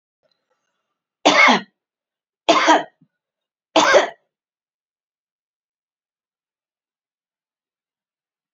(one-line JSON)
{"three_cough_length": "8.5 s", "three_cough_amplitude": 29899, "three_cough_signal_mean_std_ratio": 0.27, "survey_phase": "beta (2021-08-13 to 2022-03-07)", "age": "45-64", "gender": "Female", "wearing_mask": "No", "symptom_cough_any": true, "symptom_diarrhoea": true, "symptom_change_to_sense_of_smell_or_taste": true, "symptom_other": true, "symptom_onset": "4 days", "smoker_status": "Never smoked", "respiratory_condition_asthma": false, "respiratory_condition_other": false, "recruitment_source": "Test and Trace", "submission_delay": "2 days", "covid_test_result": "Positive", "covid_test_method": "ePCR"}